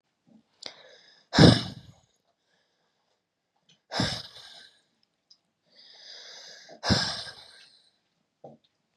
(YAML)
exhalation_length: 9.0 s
exhalation_amplitude: 24916
exhalation_signal_mean_std_ratio: 0.22
survey_phase: beta (2021-08-13 to 2022-03-07)
age: 18-44
gender: Female
wearing_mask: 'No'
symptom_cough_any: true
symptom_abdominal_pain: true
symptom_fatigue: true
symptom_headache: true
smoker_status: Never smoked
respiratory_condition_asthma: false
respiratory_condition_other: false
recruitment_source: Test and Trace
submission_delay: 2 days
covid_test_result: Positive
covid_test_method: RT-qPCR
covid_ct_value: 23.6
covid_ct_gene: ORF1ab gene
covid_ct_mean: 25.7
covid_viral_load: 3700 copies/ml
covid_viral_load_category: Minimal viral load (< 10K copies/ml)